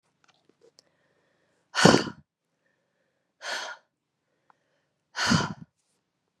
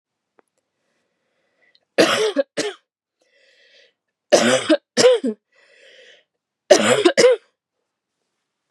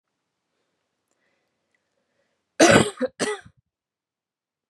{"exhalation_length": "6.4 s", "exhalation_amplitude": 27924, "exhalation_signal_mean_std_ratio": 0.24, "three_cough_length": "8.7 s", "three_cough_amplitude": 32768, "three_cough_signal_mean_std_ratio": 0.35, "cough_length": "4.7 s", "cough_amplitude": 29444, "cough_signal_mean_std_ratio": 0.23, "survey_phase": "beta (2021-08-13 to 2022-03-07)", "age": "18-44", "gender": "Female", "wearing_mask": "No", "symptom_cough_any": true, "symptom_new_continuous_cough": true, "symptom_runny_or_blocked_nose": true, "symptom_shortness_of_breath": true, "symptom_sore_throat": true, "symptom_fatigue": true, "symptom_fever_high_temperature": true, "symptom_headache": true, "symptom_onset": "4 days", "smoker_status": "Never smoked", "respiratory_condition_asthma": false, "respiratory_condition_other": false, "recruitment_source": "Test and Trace", "submission_delay": "2 days", "covid_test_result": "Positive", "covid_test_method": "RT-qPCR", "covid_ct_value": 25.2, "covid_ct_gene": "N gene"}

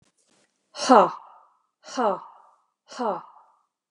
{"exhalation_length": "3.9 s", "exhalation_amplitude": 30285, "exhalation_signal_mean_std_ratio": 0.3, "survey_phase": "beta (2021-08-13 to 2022-03-07)", "age": "45-64", "gender": "Female", "wearing_mask": "No", "symptom_none": true, "smoker_status": "Ex-smoker", "respiratory_condition_asthma": false, "respiratory_condition_other": false, "recruitment_source": "REACT", "submission_delay": "1 day", "covid_test_result": "Negative", "covid_test_method": "RT-qPCR"}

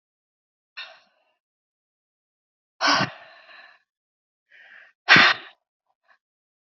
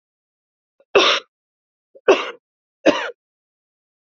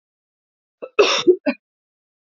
{"exhalation_length": "6.7 s", "exhalation_amplitude": 28844, "exhalation_signal_mean_std_ratio": 0.22, "three_cough_length": "4.2 s", "three_cough_amplitude": 28935, "three_cough_signal_mean_std_ratio": 0.28, "cough_length": "2.3 s", "cough_amplitude": 27884, "cough_signal_mean_std_ratio": 0.31, "survey_phase": "beta (2021-08-13 to 2022-03-07)", "age": "18-44", "gender": "Female", "wearing_mask": "No", "symptom_diarrhoea": true, "symptom_onset": "2 days", "smoker_status": "Current smoker (e-cigarettes or vapes only)", "respiratory_condition_asthma": false, "respiratory_condition_other": false, "recruitment_source": "REACT", "submission_delay": "1 day", "covid_test_result": "Negative", "covid_test_method": "RT-qPCR", "influenza_a_test_result": "Unknown/Void", "influenza_b_test_result": "Unknown/Void"}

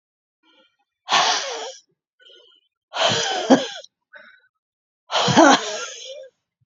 {"exhalation_length": "6.7 s", "exhalation_amplitude": 29953, "exhalation_signal_mean_std_ratio": 0.39, "survey_phase": "beta (2021-08-13 to 2022-03-07)", "age": "45-64", "gender": "Female", "wearing_mask": "No", "symptom_fatigue": true, "symptom_headache": true, "symptom_onset": "11 days", "smoker_status": "Never smoked", "respiratory_condition_asthma": false, "respiratory_condition_other": true, "recruitment_source": "REACT", "submission_delay": "1 day", "covid_test_result": "Negative", "covid_test_method": "RT-qPCR", "influenza_a_test_result": "Negative", "influenza_b_test_result": "Negative"}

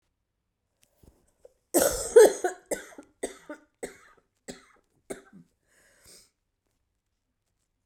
{"cough_length": "7.9 s", "cough_amplitude": 18732, "cough_signal_mean_std_ratio": 0.21, "survey_phase": "beta (2021-08-13 to 2022-03-07)", "age": "45-64", "gender": "Female", "wearing_mask": "No", "symptom_cough_any": true, "symptom_runny_or_blocked_nose": true, "symptom_sore_throat": true, "symptom_fatigue": true, "symptom_fever_high_temperature": true, "symptom_change_to_sense_of_smell_or_taste": true, "symptom_loss_of_taste": true, "symptom_other": true, "symptom_onset": "4 days", "smoker_status": "Ex-smoker", "respiratory_condition_asthma": false, "respiratory_condition_other": false, "recruitment_source": "Test and Trace", "submission_delay": "2 days", "covid_test_result": "Positive", "covid_test_method": "RT-qPCR", "covid_ct_value": 20.7, "covid_ct_gene": "ORF1ab gene", "covid_ct_mean": 21.0, "covid_viral_load": "130000 copies/ml", "covid_viral_load_category": "Low viral load (10K-1M copies/ml)"}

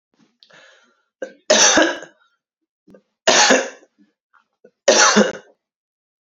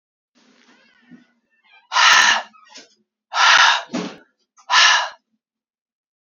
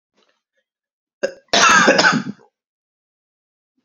{"three_cough_length": "6.2 s", "three_cough_amplitude": 32044, "three_cough_signal_mean_std_ratio": 0.37, "exhalation_length": "6.3 s", "exhalation_amplitude": 31244, "exhalation_signal_mean_std_ratio": 0.39, "cough_length": "3.8 s", "cough_amplitude": 32106, "cough_signal_mean_std_ratio": 0.36, "survey_phase": "alpha (2021-03-01 to 2021-08-12)", "age": "45-64", "gender": "Female", "wearing_mask": "No", "symptom_cough_any": true, "symptom_shortness_of_breath": true, "symptom_fatigue": true, "symptom_fever_high_temperature": true, "symptom_onset": "3 days", "smoker_status": "Never smoked", "respiratory_condition_asthma": false, "respiratory_condition_other": false, "recruitment_source": "Test and Trace", "submission_delay": "2 days", "covid_test_result": "Positive", "covid_test_method": "RT-qPCR", "covid_ct_value": 21.1, "covid_ct_gene": "ORF1ab gene", "covid_ct_mean": 21.6, "covid_viral_load": "79000 copies/ml", "covid_viral_load_category": "Low viral load (10K-1M copies/ml)"}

